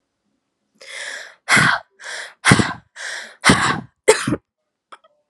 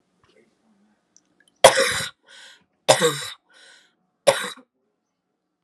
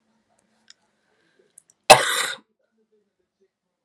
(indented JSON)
{
  "exhalation_length": "5.3 s",
  "exhalation_amplitude": 32768,
  "exhalation_signal_mean_std_ratio": 0.4,
  "three_cough_length": "5.6 s",
  "three_cough_amplitude": 32768,
  "three_cough_signal_mean_std_ratio": 0.26,
  "cough_length": "3.8 s",
  "cough_amplitude": 32768,
  "cough_signal_mean_std_ratio": 0.18,
  "survey_phase": "alpha (2021-03-01 to 2021-08-12)",
  "age": "18-44",
  "gender": "Female",
  "wearing_mask": "No",
  "symptom_cough_any": true,
  "symptom_new_continuous_cough": true,
  "symptom_shortness_of_breath": true,
  "symptom_fatigue": true,
  "symptom_headache": true,
  "symptom_change_to_sense_of_smell_or_taste": true,
  "symptom_onset": "3 days",
  "smoker_status": "Never smoked",
  "respiratory_condition_asthma": false,
  "respiratory_condition_other": false,
  "recruitment_source": "Test and Trace",
  "submission_delay": "1 day",
  "covid_test_result": "Positive",
  "covid_test_method": "RT-qPCR",
  "covid_ct_value": 12.4,
  "covid_ct_gene": "ORF1ab gene",
  "covid_ct_mean": 13.1,
  "covid_viral_load": "51000000 copies/ml",
  "covid_viral_load_category": "High viral load (>1M copies/ml)"
}